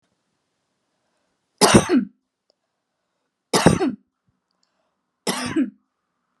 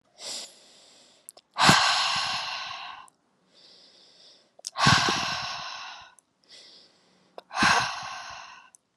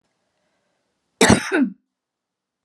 {"three_cough_length": "6.4 s", "three_cough_amplitude": 32637, "three_cough_signal_mean_std_ratio": 0.3, "exhalation_length": "9.0 s", "exhalation_amplitude": 25975, "exhalation_signal_mean_std_ratio": 0.43, "cough_length": "2.6 s", "cough_amplitude": 32767, "cough_signal_mean_std_ratio": 0.29, "survey_phase": "alpha (2021-03-01 to 2021-08-12)", "age": "18-44", "gender": "Female", "wearing_mask": "No", "symptom_none": true, "symptom_onset": "2 days", "smoker_status": "Never smoked", "respiratory_condition_asthma": false, "respiratory_condition_other": false, "recruitment_source": "Test and Trace", "submission_delay": "2 days", "covid_test_result": "Positive", "covid_test_method": "RT-qPCR", "covid_ct_value": 19.6, "covid_ct_gene": "ORF1ab gene", "covid_ct_mean": 19.9, "covid_viral_load": "300000 copies/ml", "covid_viral_load_category": "Low viral load (10K-1M copies/ml)"}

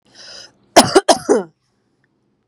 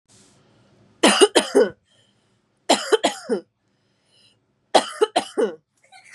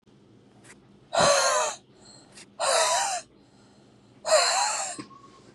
{"cough_length": "2.5 s", "cough_amplitude": 32768, "cough_signal_mean_std_ratio": 0.31, "three_cough_length": "6.1 s", "three_cough_amplitude": 30241, "three_cough_signal_mean_std_ratio": 0.34, "exhalation_length": "5.5 s", "exhalation_amplitude": 13306, "exhalation_signal_mean_std_ratio": 0.52, "survey_phase": "beta (2021-08-13 to 2022-03-07)", "age": "18-44", "gender": "Female", "wearing_mask": "No", "symptom_none": true, "smoker_status": "Ex-smoker", "respiratory_condition_asthma": false, "respiratory_condition_other": false, "recruitment_source": "REACT", "submission_delay": "0 days", "covid_test_result": "Negative", "covid_test_method": "RT-qPCR", "influenza_a_test_result": "Negative", "influenza_b_test_result": "Negative"}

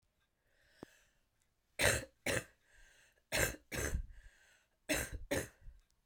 {"three_cough_length": "6.1 s", "three_cough_amplitude": 5791, "three_cough_signal_mean_std_ratio": 0.39, "survey_phase": "beta (2021-08-13 to 2022-03-07)", "age": "45-64", "gender": "Female", "wearing_mask": "No", "symptom_cough_any": true, "symptom_runny_or_blocked_nose": true, "symptom_fatigue": true, "symptom_onset": "3 days", "smoker_status": "Never smoked", "respiratory_condition_asthma": true, "respiratory_condition_other": false, "recruitment_source": "Test and Trace", "submission_delay": "2 days", "covid_test_result": "Positive", "covid_test_method": "RT-qPCR"}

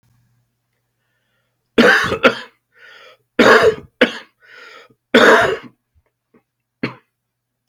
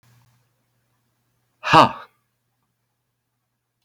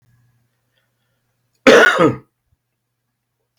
{"three_cough_length": "7.7 s", "three_cough_amplitude": 32768, "three_cough_signal_mean_std_ratio": 0.34, "exhalation_length": "3.8 s", "exhalation_amplitude": 32768, "exhalation_signal_mean_std_ratio": 0.18, "cough_length": "3.6 s", "cough_amplitude": 32768, "cough_signal_mean_std_ratio": 0.28, "survey_phase": "beta (2021-08-13 to 2022-03-07)", "age": "45-64", "gender": "Male", "wearing_mask": "No", "symptom_cough_any": true, "symptom_runny_or_blocked_nose": true, "symptom_shortness_of_breath": true, "symptom_change_to_sense_of_smell_or_taste": true, "symptom_loss_of_taste": true, "symptom_onset": "8 days", "smoker_status": "Ex-smoker", "respiratory_condition_asthma": false, "respiratory_condition_other": false, "recruitment_source": "REACT", "submission_delay": "2 days", "covid_test_result": "Positive", "covid_test_method": "RT-qPCR", "covid_ct_value": 21.9, "covid_ct_gene": "E gene", "influenza_a_test_result": "Negative", "influenza_b_test_result": "Negative"}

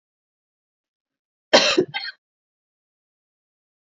{"cough_length": "3.8 s", "cough_amplitude": 31093, "cough_signal_mean_std_ratio": 0.23, "survey_phase": "beta (2021-08-13 to 2022-03-07)", "age": "18-44", "gender": "Female", "wearing_mask": "No", "symptom_runny_or_blocked_nose": true, "symptom_sore_throat": true, "symptom_other": true, "smoker_status": "Ex-smoker", "respiratory_condition_asthma": false, "respiratory_condition_other": false, "recruitment_source": "Test and Trace", "submission_delay": "2 days", "covid_test_result": "Positive", "covid_test_method": "RT-qPCR", "covid_ct_value": 17.3, "covid_ct_gene": "N gene", "covid_ct_mean": 18.8, "covid_viral_load": "700000 copies/ml", "covid_viral_load_category": "Low viral load (10K-1M copies/ml)"}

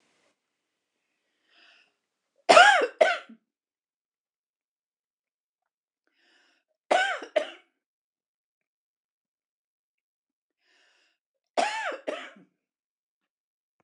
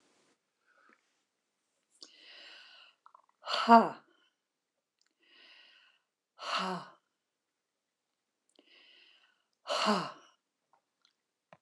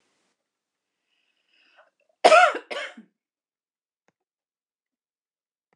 {"three_cough_length": "13.8 s", "three_cough_amplitude": 26027, "three_cough_signal_mean_std_ratio": 0.2, "exhalation_length": "11.6 s", "exhalation_amplitude": 16416, "exhalation_signal_mean_std_ratio": 0.2, "cough_length": "5.8 s", "cough_amplitude": 26028, "cough_signal_mean_std_ratio": 0.19, "survey_phase": "beta (2021-08-13 to 2022-03-07)", "age": "65+", "gender": "Female", "wearing_mask": "No", "symptom_cough_any": true, "symptom_change_to_sense_of_smell_or_taste": true, "smoker_status": "Never smoked", "respiratory_condition_asthma": false, "respiratory_condition_other": false, "recruitment_source": "REACT", "submission_delay": "2 days", "covid_test_result": "Negative", "covid_test_method": "RT-qPCR", "influenza_a_test_result": "Negative", "influenza_b_test_result": "Negative"}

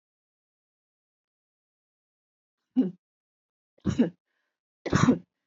{"three_cough_length": "5.5 s", "three_cough_amplitude": 14509, "three_cough_signal_mean_std_ratio": 0.25, "survey_phase": "beta (2021-08-13 to 2022-03-07)", "age": "45-64", "gender": "Female", "wearing_mask": "No", "symptom_none": true, "smoker_status": "Never smoked", "respiratory_condition_asthma": false, "respiratory_condition_other": false, "recruitment_source": "REACT", "submission_delay": "2 days", "covid_test_result": "Negative", "covid_test_method": "RT-qPCR", "influenza_a_test_result": "Negative", "influenza_b_test_result": "Negative"}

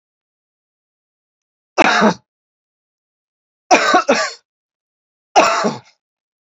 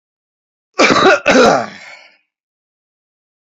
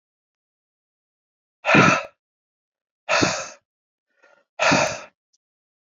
{"three_cough_length": "6.6 s", "three_cough_amplitude": 32768, "three_cough_signal_mean_std_ratio": 0.34, "cough_length": "3.4 s", "cough_amplitude": 32064, "cough_signal_mean_std_ratio": 0.41, "exhalation_length": "6.0 s", "exhalation_amplitude": 26217, "exhalation_signal_mean_std_ratio": 0.32, "survey_phase": "beta (2021-08-13 to 2022-03-07)", "age": "18-44", "gender": "Male", "wearing_mask": "No", "symptom_cough_any": true, "symptom_runny_or_blocked_nose": true, "symptom_fever_high_temperature": true, "symptom_other": true, "smoker_status": "Never smoked", "respiratory_condition_asthma": false, "respiratory_condition_other": false, "recruitment_source": "Test and Trace", "submission_delay": "2 days", "covid_test_result": "Positive", "covid_test_method": "RT-qPCR", "covid_ct_value": 18.4, "covid_ct_gene": "N gene"}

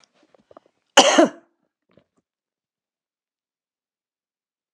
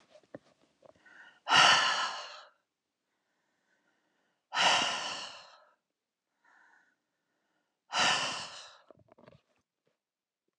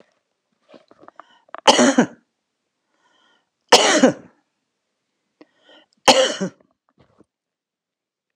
{"cough_length": "4.7 s", "cough_amplitude": 32768, "cough_signal_mean_std_ratio": 0.19, "exhalation_length": "10.6 s", "exhalation_amplitude": 12426, "exhalation_signal_mean_std_ratio": 0.32, "three_cough_length": "8.4 s", "three_cough_amplitude": 32768, "three_cough_signal_mean_std_ratio": 0.27, "survey_phase": "alpha (2021-03-01 to 2021-08-12)", "age": "45-64", "gender": "Female", "wearing_mask": "No", "symptom_none": true, "smoker_status": "Current smoker (11 or more cigarettes per day)", "respiratory_condition_asthma": false, "respiratory_condition_other": false, "recruitment_source": "REACT", "submission_delay": "2 days", "covid_test_result": "Negative", "covid_test_method": "RT-qPCR"}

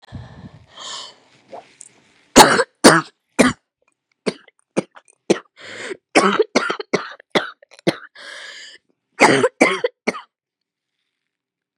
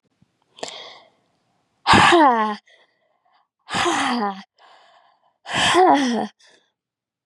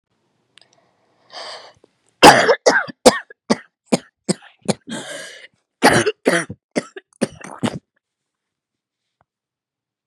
{"three_cough_length": "11.8 s", "three_cough_amplitude": 32768, "three_cough_signal_mean_std_ratio": 0.31, "exhalation_length": "7.3 s", "exhalation_amplitude": 29711, "exhalation_signal_mean_std_ratio": 0.43, "cough_length": "10.1 s", "cough_amplitude": 32768, "cough_signal_mean_std_ratio": 0.28, "survey_phase": "beta (2021-08-13 to 2022-03-07)", "age": "18-44", "gender": "Female", "wearing_mask": "No", "symptom_new_continuous_cough": true, "symptom_runny_or_blocked_nose": true, "symptom_shortness_of_breath": true, "symptom_onset": "12 days", "smoker_status": "Never smoked", "respiratory_condition_asthma": false, "respiratory_condition_other": false, "recruitment_source": "REACT", "submission_delay": "2 days", "covid_test_result": "Negative", "covid_test_method": "RT-qPCR", "influenza_a_test_result": "Negative", "influenza_b_test_result": "Negative"}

